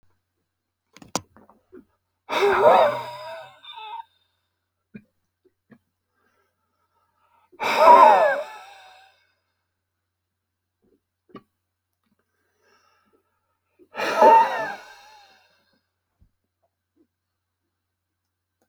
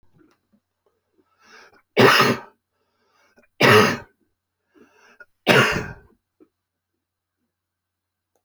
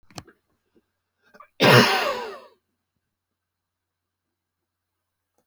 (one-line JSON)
{"exhalation_length": "18.7 s", "exhalation_amplitude": 27866, "exhalation_signal_mean_std_ratio": 0.27, "three_cough_length": "8.4 s", "three_cough_amplitude": 27988, "three_cough_signal_mean_std_ratio": 0.29, "cough_length": "5.5 s", "cough_amplitude": 26336, "cough_signal_mean_std_ratio": 0.25, "survey_phase": "beta (2021-08-13 to 2022-03-07)", "age": "65+", "gender": "Male", "wearing_mask": "No", "symptom_none": true, "smoker_status": "Never smoked", "respiratory_condition_asthma": false, "respiratory_condition_other": false, "recruitment_source": "REACT", "submission_delay": "0 days", "covid_test_result": "Negative", "covid_test_method": "RT-qPCR"}